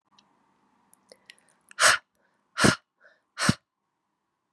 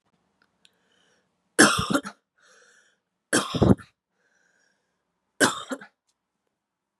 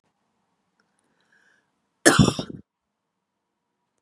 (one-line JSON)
{"exhalation_length": "4.5 s", "exhalation_amplitude": 22562, "exhalation_signal_mean_std_ratio": 0.24, "three_cough_length": "7.0 s", "three_cough_amplitude": 28343, "three_cough_signal_mean_std_ratio": 0.26, "cough_length": "4.0 s", "cough_amplitude": 32768, "cough_signal_mean_std_ratio": 0.2, "survey_phase": "beta (2021-08-13 to 2022-03-07)", "age": "18-44", "gender": "Female", "wearing_mask": "No", "symptom_cough_any": true, "symptom_sore_throat": true, "symptom_abdominal_pain": true, "symptom_fatigue": true, "symptom_headache": true, "smoker_status": "Never smoked", "respiratory_condition_asthma": false, "respiratory_condition_other": false, "recruitment_source": "Test and Trace", "submission_delay": "1 day", "covid_test_result": "Positive", "covid_test_method": "RT-qPCR", "covid_ct_value": 24.6, "covid_ct_gene": "ORF1ab gene", "covid_ct_mean": 25.2, "covid_viral_load": "5200 copies/ml", "covid_viral_load_category": "Minimal viral load (< 10K copies/ml)"}